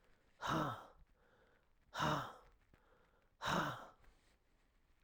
exhalation_length: 5.0 s
exhalation_amplitude: 2371
exhalation_signal_mean_std_ratio: 0.41
survey_phase: alpha (2021-03-01 to 2021-08-12)
age: 45-64
gender: Male
wearing_mask: 'No'
symptom_none: true
smoker_status: Never smoked
respiratory_condition_asthma: false
respiratory_condition_other: false
recruitment_source: REACT
submission_delay: 1 day
covid_test_result: Negative
covid_test_method: RT-qPCR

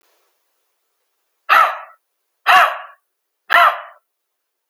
exhalation_length: 4.7 s
exhalation_amplitude: 32768
exhalation_signal_mean_std_ratio: 0.33
survey_phase: alpha (2021-03-01 to 2021-08-12)
age: 18-44
gender: Male
wearing_mask: 'No'
symptom_none: true
smoker_status: Never smoked
respiratory_condition_asthma: false
respiratory_condition_other: false
recruitment_source: REACT
submission_delay: 1 day
covid_test_result: Negative
covid_test_method: RT-qPCR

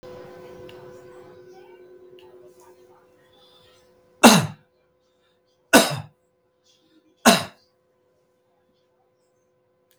three_cough_length: 10.0 s
three_cough_amplitude: 32768
three_cough_signal_mean_std_ratio: 0.21
survey_phase: beta (2021-08-13 to 2022-03-07)
age: 65+
gender: Male
wearing_mask: 'No'
symptom_none: true
smoker_status: Ex-smoker
respiratory_condition_asthma: false
respiratory_condition_other: false
recruitment_source: REACT
submission_delay: 1 day
covid_test_result: Negative
covid_test_method: RT-qPCR
influenza_a_test_result: Negative
influenza_b_test_result: Negative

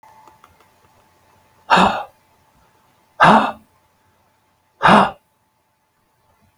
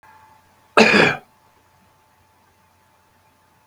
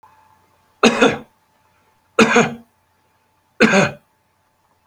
exhalation_length: 6.6 s
exhalation_amplitude: 32768
exhalation_signal_mean_std_ratio: 0.29
cough_length: 3.7 s
cough_amplitude: 32768
cough_signal_mean_std_ratio: 0.26
three_cough_length: 4.9 s
three_cough_amplitude: 32768
three_cough_signal_mean_std_ratio: 0.34
survey_phase: beta (2021-08-13 to 2022-03-07)
age: 65+
gender: Male
wearing_mask: 'No'
symptom_none: true
smoker_status: Current smoker (e-cigarettes or vapes only)
respiratory_condition_asthma: false
respiratory_condition_other: false
recruitment_source: REACT
submission_delay: 1 day
covid_test_result: Negative
covid_test_method: RT-qPCR
influenza_a_test_result: Negative
influenza_b_test_result: Negative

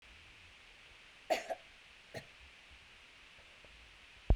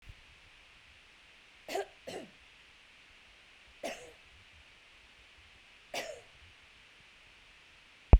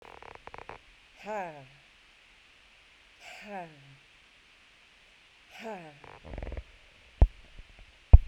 cough_length: 4.4 s
cough_amplitude: 6326
cough_signal_mean_std_ratio: 0.27
three_cough_length: 8.2 s
three_cough_amplitude: 21193
three_cough_signal_mean_std_ratio: 0.16
exhalation_length: 8.3 s
exhalation_amplitude: 32002
exhalation_signal_mean_std_ratio: 0.16
survey_phase: beta (2021-08-13 to 2022-03-07)
age: 45-64
gender: Female
wearing_mask: 'No'
symptom_none: true
smoker_status: Never smoked
respiratory_condition_asthma: false
respiratory_condition_other: false
recruitment_source: REACT
submission_delay: 1 day
covid_test_result: Negative
covid_test_method: RT-qPCR
influenza_a_test_result: Negative
influenza_b_test_result: Negative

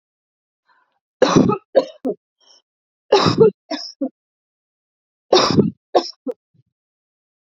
three_cough_length: 7.4 s
three_cough_amplitude: 29058
three_cough_signal_mean_std_ratio: 0.35
survey_phase: beta (2021-08-13 to 2022-03-07)
age: 45-64
gender: Female
wearing_mask: 'No'
symptom_runny_or_blocked_nose: true
smoker_status: Ex-smoker
respiratory_condition_asthma: true
respiratory_condition_other: false
recruitment_source: REACT
submission_delay: 1 day
covid_test_result: Negative
covid_test_method: RT-qPCR
influenza_a_test_result: Unknown/Void
influenza_b_test_result: Unknown/Void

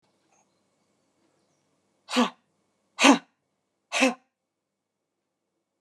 exhalation_length: 5.8 s
exhalation_amplitude: 26750
exhalation_signal_mean_std_ratio: 0.22
survey_phase: alpha (2021-03-01 to 2021-08-12)
age: 45-64
gender: Female
wearing_mask: 'No'
symptom_none: true
symptom_onset: 4 days
smoker_status: Ex-smoker
respiratory_condition_asthma: false
respiratory_condition_other: false
recruitment_source: REACT
submission_delay: 2 days
covid_test_result: Negative
covid_test_method: RT-qPCR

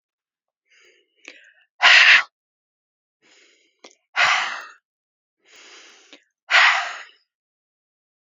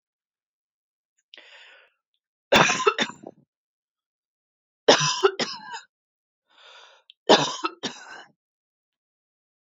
exhalation_length: 8.3 s
exhalation_amplitude: 29065
exhalation_signal_mean_std_ratio: 0.29
three_cough_length: 9.6 s
three_cough_amplitude: 28860
three_cough_signal_mean_std_ratio: 0.27
survey_phase: beta (2021-08-13 to 2022-03-07)
age: 18-44
gender: Female
wearing_mask: 'No'
symptom_runny_or_blocked_nose: true
smoker_status: Ex-smoker
respiratory_condition_asthma: false
respiratory_condition_other: false
recruitment_source: REACT
submission_delay: 5 days
covid_test_result: Negative
covid_test_method: RT-qPCR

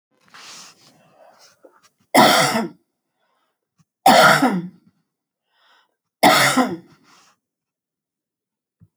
three_cough_length: 9.0 s
three_cough_amplitude: 29108
three_cough_signal_mean_std_ratio: 0.34
survey_phase: alpha (2021-03-01 to 2021-08-12)
age: 65+
gender: Female
wearing_mask: 'No'
symptom_none: true
smoker_status: Ex-smoker
respiratory_condition_asthma: false
respiratory_condition_other: false
recruitment_source: REACT
submission_delay: 1 day
covid_test_result: Negative
covid_test_method: RT-qPCR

